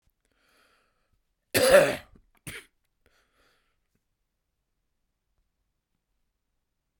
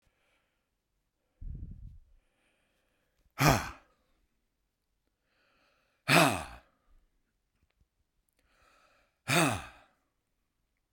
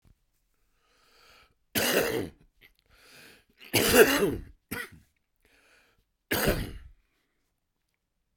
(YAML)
cough_length: 7.0 s
cough_amplitude: 21558
cough_signal_mean_std_ratio: 0.19
exhalation_length: 10.9 s
exhalation_amplitude: 14786
exhalation_signal_mean_std_ratio: 0.23
three_cough_length: 8.4 s
three_cough_amplitude: 18491
three_cough_signal_mean_std_ratio: 0.33
survey_phase: beta (2021-08-13 to 2022-03-07)
age: 65+
gender: Male
wearing_mask: 'No'
symptom_cough_any: true
symptom_onset: 3 days
smoker_status: Never smoked
respiratory_condition_asthma: true
respiratory_condition_other: false
recruitment_source: Test and Trace
submission_delay: 1 day
covid_test_result: Positive
covid_test_method: RT-qPCR
covid_ct_value: 22.3
covid_ct_gene: E gene